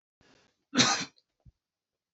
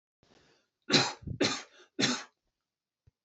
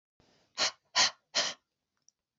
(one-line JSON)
{"cough_length": "2.1 s", "cough_amplitude": 15248, "cough_signal_mean_std_ratio": 0.28, "three_cough_length": "3.2 s", "three_cough_amplitude": 10788, "three_cough_signal_mean_std_ratio": 0.35, "exhalation_length": "2.4 s", "exhalation_amplitude": 9029, "exhalation_signal_mean_std_ratio": 0.33, "survey_phase": "beta (2021-08-13 to 2022-03-07)", "age": "45-64", "gender": "Male", "wearing_mask": "No", "symptom_none": true, "smoker_status": "Never smoked", "respiratory_condition_asthma": false, "respiratory_condition_other": false, "recruitment_source": "REACT", "submission_delay": "3 days", "covid_test_result": "Negative", "covid_test_method": "RT-qPCR", "influenza_a_test_result": "Negative", "influenza_b_test_result": "Negative"}